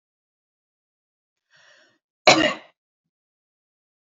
{"cough_length": "4.0 s", "cough_amplitude": 30003, "cough_signal_mean_std_ratio": 0.18, "survey_phase": "beta (2021-08-13 to 2022-03-07)", "age": "45-64", "gender": "Female", "wearing_mask": "No", "symptom_none": true, "smoker_status": "Never smoked", "respiratory_condition_asthma": false, "respiratory_condition_other": false, "recruitment_source": "REACT", "submission_delay": "2 days", "covid_test_result": "Negative", "covid_test_method": "RT-qPCR", "influenza_a_test_result": "Negative", "influenza_b_test_result": "Negative"}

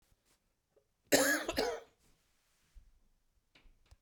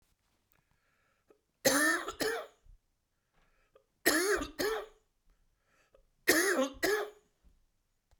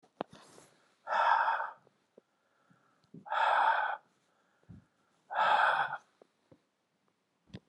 {"cough_length": "4.0 s", "cough_amplitude": 6591, "cough_signal_mean_std_ratio": 0.3, "three_cough_length": "8.2 s", "three_cough_amplitude": 9589, "three_cough_signal_mean_std_ratio": 0.4, "exhalation_length": "7.7 s", "exhalation_amplitude": 6496, "exhalation_signal_mean_std_ratio": 0.42, "survey_phase": "beta (2021-08-13 to 2022-03-07)", "age": "65+", "gender": "Male", "wearing_mask": "No", "symptom_cough_any": true, "symptom_runny_or_blocked_nose": true, "symptom_sore_throat": true, "symptom_fatigue": true, "symptom_fever_high_temperature": true, "symptom_headache": true, "symptom_change_to_sense_of_smell_or_taste": true, "symptom_onset": "4 days", "smoker_status": "Ex-smoker", "respiratory_condition_asthma": false, "respiratory_condition_other": false, "recruitment_source": "Test and Trace", "submission_delay": "2 days", "covid_test_result": "Positive", "covid_test_method": "RT-qPCR", "covid_ct_value": 23.7, "covid_ct_gene": "ORF1ab gene", "covid_ct_mean": 24.4, "covid_viral_load": "10000 copies/ml", "covid_viral_load_category": "Low viral load (10K-1M copies/ml)"}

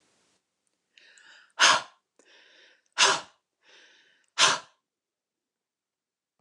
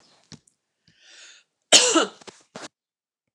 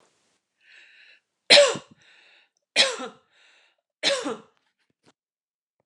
{"exhalation_length": "6.4 s", "exhalation_amplitude": 19457, "exhalation_signal_mean_std_ratio": 0.24, "cough_length": "3.3 s", "cough_amplitude": 29204, "cough_signal_mean_std_ratio": 0.25, "three_cough_length": "5.9 s", "three_cough_amplitude": 28956, "three_cough_signal_mean_std_ratio": 0.25, "survey_phase": "beta (2021-08-13 to 2022-03-07)", "age": "45-64", "gender": "Female", "wearing_mask": "No", "symptom_none": true, "smoker_status": "Never smoked", "respiratory_condition_asthma": false, "respiratory_condition_other": false, "recruitment_source": "Test and Trace", "submission_delay": "-1 day", "covid_test_result": "Negative", "covid_test_method": "LFT"}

